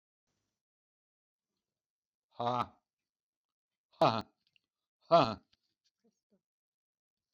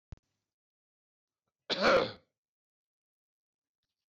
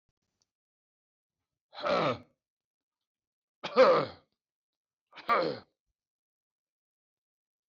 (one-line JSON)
{"exhalation_length": "7.3 s", "exhalation_amplitude": 7066, "exhalation_signal_mean_std_ratio": 0.2, "cough_length": "4.1 s", "cough_amplitude": 5924, "cough_signal_mean_std_ratio": 0.24, "three_cough_length": "7.7 s", "three_cough_amplitude": 8607, "three_cough_signal_mean_std_ratio": 0.27, "survey_phase": "beta (2021-08-13 to 2022-03-07)", "age": "65+", "gender": "Male", "wearing_mask": "No", "symptom_none": true, "smoker_status": "Ex-smoker", "respiratory_condition_asthma": false, "respiratory_condition_other": false, "recruitment_source": "REACT", "submission_delay": "2 days", "covid_test_result": "Negative", "covid_test_method": "RT-qPCR"}